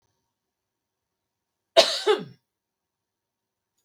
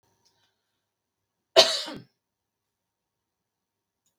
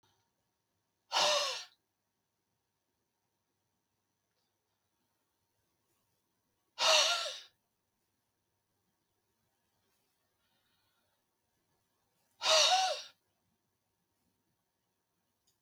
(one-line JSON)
{"three_cough_length": "3.8 s", "three_cough_amplitude": 26256, "three_cough_signal_mean_std_ratio": 0.21, "cough_length": "4.2 s", "cough_amplitude": 31339, "cough_signal_mean_std_ratio": 0.17, "exhalation_length": "15.6 s", "exhalation_amplitude": 6894, "exhalation_signal_mean_std_ratio": 0.25, "survey_phase": "beta (2021-08-13 to 2022-03-07)", "age": "65+", "gender": "Female", "wearing_mask": "No", "symptom_none": true, "smoker_status": "Never smoked", "respiratory_condition_asthma": false, "respiratory_condition_other": false, "recruitment_source": "REACT", "submission_delay": "1 day", "covid_test_result": "Negative", "covid_test_method": "RT-qPCR", "influenza_a_test_result": "Negative", "influenza_b_test_result": "Negative"}